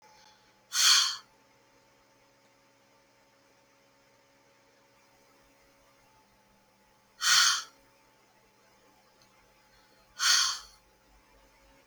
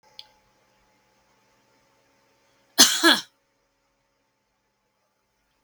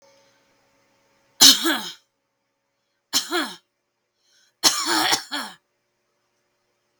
{
  "exhalation_length": "11.9 s",
  "exhalation_amplitude": 11426,
  "exhalation_signal_mean_std_ratio": 0.27,
  "cough_length": "5.6 s",
  "cough_amplitude": 32766,
  "cough_signal_mean_std_ratio": 0.19,
  "three_cough_length": "7.0 s",
  "three_cough_amplitude": 32768,
  "three_cough_signal_mean_std_ratio": 0.29,
  "survey_phase": "beta (2021-08-13 to 2022-03-07)",
  "age": "18-44",
  "gender": "Female",
  "wearing_mask": "No",
  "symptom_none": true,
  "symptom_onset": "5 days",
  "smoker_status": "Never smoked",
  "respiratory_condition_asthma": false,
  "respiratory_condition_other": false,
  "recruitment_source": "REACT",
  "submission_delay": "1 day",
  "covid_test_result": "Negative",
  "covid_test_method": "RT-qPCR"
}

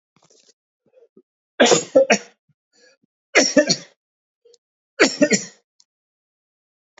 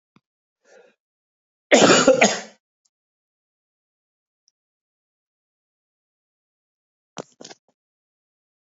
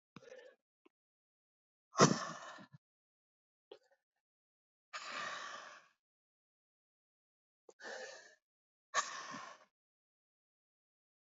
{
  "three_cough_length": "7.0 s",
  "three_cough_amplitude": 31413,
  "three_cough_signal_mean_std_ratio": 0.3,
  "cough_length": "8.7 s",
  "cough_amplitude": 29392,
  "cough_signal_mean_std_ratio": 0.21,
  "exhalation_length": "11.3 s",
  "exhalation_amplitude": 8514,
  "exhalation_signal_mean_std_ratio": 0.21,
  "survey_phase": "alpha (2021-03-01 to 2021-08-12)",
  "age": "45-64",
  "gender": "Male",
  "wearing_mask": "No",
  "symptom_cough_any": true,
  "symptom_diarrhoea": true,
  "symptom_fatigue": true,
  "symptom_headache": true,
  "smoker_status": "Never smoked",
  "respiratory_condition_asthma": false,
  "respiratory_condition_other": false,
  "recruitment_source": "Test and Trace",
  "submission_delay": "2 days",
  "covid_test_result": "Positive",
  "covid_test_method": "LFT"
}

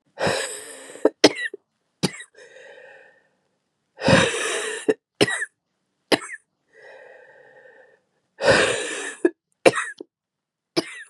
{
  "exhalation_length": "11.1 s",
  "exhalation_amplitude": 32768,
  "exhalation_signal_mean_std_ratio": 0.36,
  "survey_phase": "beta (2021-08-13 to 2022-03-07)",
  "age": "18-44",
  "gender": "Female",
  "wearing_mask": "No",
  "symptom_cough_any": true,
  "symptom_new_continuous_cough": true,
  "symptom_runny_or_blocked_nose": true,
  "symptom_sore_throat": true,
  "symptom_diarrhoea": true,
  "symptom_fatigue": true,
  "symptom_fever_high_temperature": true,
  "symptom_headache": true,
  "symptom_change_to_sense_of_smell_or_taste": true,
  "symptom_loss_of_taste": true,
  "symptom_onset": "5 days",
  "smoker_status": "Never smoked",
  "respiratory_condition_asthma": false,
  "respiratory_condition_other": false,
  "recruitment_source": "Test and Trace",
  "submission_delay": "1 day",
  "covid_test_result": "Positive",
  "covid_test_method": "RT-qPCR",
  "covid_ct_value": 18.1,
  "covid_ct_gene": "N gene",
  "covid_ct_mean": 18.5,
  "covid_viral_load": "870000 copies/ml",
  "covid_viral_load_category": "Low viral load (10K-1M copies/ml)"
}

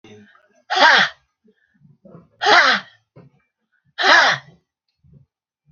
{
  "exhalation_length": "5.7 s",
  "exhalation_amplitude": 32768,
  "exhalation_signal_mean_std_ratio": 0.37,
  "survey_phase": "beta (2021-08-13 to 2022-03-07)",
  "age": "65+",
  "gender": "Female",
  "wearing_mask": "No",
  "symptom_none": true,
  "smoker_status": "Ex-smoker",
  "respiratory_condition_asthma": false,
  "respiratory_condition_other": false,
  "recruitment_source": "REACT",
  "submission_delay": "1 day",
  "covid_test_result": "Negative",
  "covid_test_method": "RT-qPCR"
}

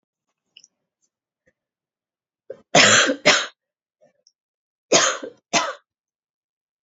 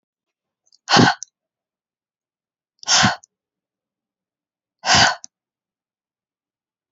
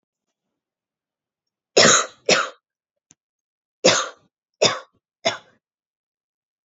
{
  "three_cough_length": "6.8 s",
  "three_cough_amplitude": 32208,
  "three_cough_signal_mean_std_ratio": 0.3,
  "exhalation_length": "6.9 s",
  "exhalation_amplitude": 32591,
  "exhalation_signal_mean_std_ratio": 0.26,
  "cough_length": "6.7 s",
  "cough_amplitude": 32767,
  "cough_signal_mean_std_ratio": 0.27,
  "survey_phase": "beta (2021-08-13 to 2022-03-07)",
  "age": "18-44",
  "gender": "Female",
  "wearing_mask": "No",
  "symptom_cough_any": true,
  "symptom_runny_or_blocked_nose": true,
  "symptom_shortness_of_breath": true,
  "symptom_sore_throat": true,
  "symptom_fatigue": true,
  "symptom_fever_high_temperature": true,
  "symptom_headache": true,
  "symptom_other": true,
  "smoker_status": "Never smoked",
  "respiratory_condition_asthma": false,
  "respiratory_condition_other": false,
  "recruitment_source": "Test and Trace",
  "submission_delay": "3 days",
  "covid_test_result": "Positive",
  "covid_test_method": "RT-qPCR",
  "covid_ct_value": 21.0,
  "covid_ct_gene": "ORF1ab gene",
  "covid_ct_mean": 21.9,
  "covid_viral_load": "68000 copies/ml",
  "covid_viral_load_category": "Low viral load (10K-1M copies/ml)"
}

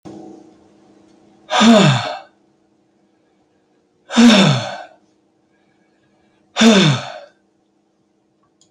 {
  "exhalation_length": "8.7 s",
  "exhalation_amplitude": 30085,
  "exhalation_signal_mean_std_ratio": 0.36,
  "survey_phase": "beta (2021-08-13 to 2022-03-07)",
  "age": "65+",
  "gender": "Male",
  "wearing_mask": "No",
  "symptom_cough_any": true,
  "smoker_status": "Ex-smoker",
  "respiratory_condition_asthma": false,
  "respiratory_condition_other": true,
  "recruitment_source": "REACT",
  "submission_delay": "5 days",
  "covid_test_result": "Negative",
  "covid_test_method": "RT-qPCR",
  "covid_ct_value": 37.0,
  "covid_ct_gene": "E gene"
}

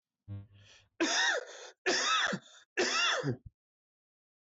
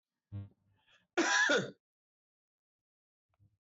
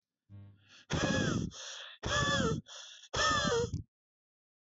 {
  "three_cough_length": "4.5 s",
  "three_cough_amplitude": 3893,
  "three_cough_signal_mean_std_ratio": 0.55,
  "cough_length": "3.7 s",
  "cough_amplitude": 3729,
  "cough_signal_mean_std_ratio": 0.33,
  "exhalation_length": "4.6 s",
  "exhalation_amplitude": 3993,
  "exhalation_signal_mean_std_ratio": 0.61,
  "survey_phase": "beta (2021-08-13 to 2022-03-07)",
  "age": "18-44",
  "gender": "Male",
  "wearing_mask": "No",
  "symptom_runny_or_blocked_nose": true,
  "symptom_fatigue": true,
  "symptom_headache": true,
  "smoker_status": "Never smoked",
  "respiratory_condition_asthma": false,
  "respiratory_condition_other": false,
  "recruitment_source": "Test and Trace",
  "submission_delay": "2 days",
  "covid_test_result": "Positive",
  "covid_test_method": "LAMP"
}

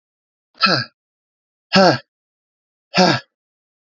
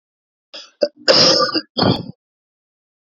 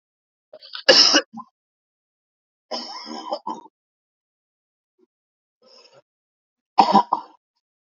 {
  "exhalation_length": "3.9 s",
  "exhalation_amplitude": 31367,
  "exhalation_signal_mean_std_ratio": 0.32,
  "cough_length": "3.1 s",
  "cough_amplitude": 30169,
  "cough_signal_mean_std_ratio": 0.42,
  "three_cough_length": "7.9 s",
  "three_cough_amplitude": 32146,
  "three_cough_signal_mean_std_ratio": 0.25,
  "survey_phase": "beta (2021-08-13 to 2022-03-07)",
  "age": "18-44",
  "gender": "Male",
  "wearing_mask": "No",
  "symptom_cough_any": true,
  "symptom_runny_or_blocked_nose": true,
  "symptom_headache": true,
  "smoker_status": "Current smoker (e-cigarettes or vapes only)",
  "respiratory_condition_asthma": false,
  "respiratory_condition_other": false,
  "recruitment_source": "Test and Trace",
  "submission_delay": "1 day",
  "covid_test_result": "Positive",
  "covid_test_method": "ePCR"
}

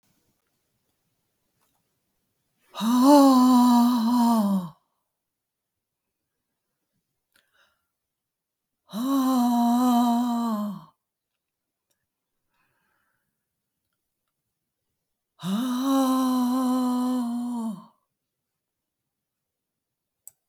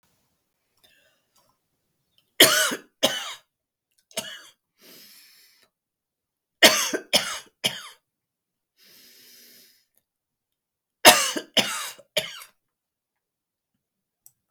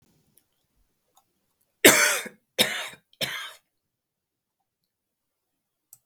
{
  "exhalation_length": "20.5 s",
  "exhalation_amplitude": 17507,
  "exhalation_signal_mean_std_ratio": 0.46,
  "three_cough_length": "14.5 s",
  "three_cough_amplitude": 32768,
  "three_cough_signal_mean_std_ratio": 0.24,
  "cough_length": "6.1 s",
  "cough_amplitude": 32766,
  "cough_signal_mean_std_ratio": 0.23,
  "survey_phase": "beta (2021-08-13 to 2022-03-07)",
  "age": "65+",
  "gender": "Female",
  "wearing_mask": "No",
  "symptom_none": true,
  "smoker_status": "Prefer not to say",
  "respiratory_condition_asthma": true,
  "respiratory_condition_other": false,
  "recruitment_source": "REACT",
  "submission_delay": "3 days",
  "covid_test_result": "Negative",
  "covid_test_method": "RT-qPCR"
}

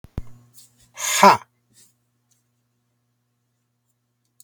{
  "exhalation_length": "4.4 s",
  "exhalation_amplitude": 32768,
  "exhalation_signal_mean_std_ratio": 0.21,
  "survey_phase": "beta (2021-08-13 to 2022-03-07)",
  "age": "45-64",
  "gender": "Male",
  "wearing_mask": "No",
  "symptom_none": true,
  "smoker_status": "Never smoked",
  "respiratory_condition_asthma": true,
  "respiratory_condition_other": false,
  "recruitment_source": "REACT",
  "submission_delay": "2 days",
  "covid_test_result": "Negative",
  "covid_test_method": "RT-qPCR",
  "covid_ct_value": 38.0,
  "covid_ct_gene": "N gene"
}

